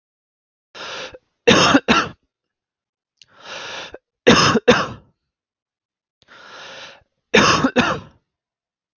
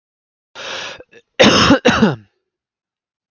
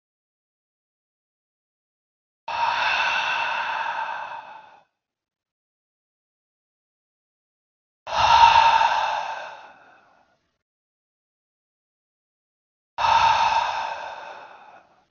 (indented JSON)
{
  "three_cough_length": "9.0 s",
  "three_cough_amplitude": 32767,
  "three_cough_signal_mean_std_ratio": 0.36,
  "cough_length": "3.3 s",
  "cough_amplitude": 32768,
  "cough_signal_mean_std_ratio": 0.4,
  "exhalation_length": "15.1 s",
  "exhalation_amplitude": 24995,
  "exhalation_signal_mean_std_ratio": 0.4,
  "survey_phase": "beta (2021-08-13 to 2022-03-07)",
  "age": "18-44",
  "gender": "Male",
  "wearing_mask": "No",
  "symptom_sore_throat": true,
  "symptom_headache": true,
  "symptom_onset": "2 days",
  "smoker_status": "Never smoked",
  "respiratory_condition_asthma": false,
  "respiratory_condition_other": false,
  "recruitment_source": "Test and Trace",
  "submission_delay": "2 days",
  "covid_test_result": "Positive",
  "covid_test_method": "RT-qPCR",
  "covid_ct_value": 30.0,
  "covid_ct_gene": "N gene"
}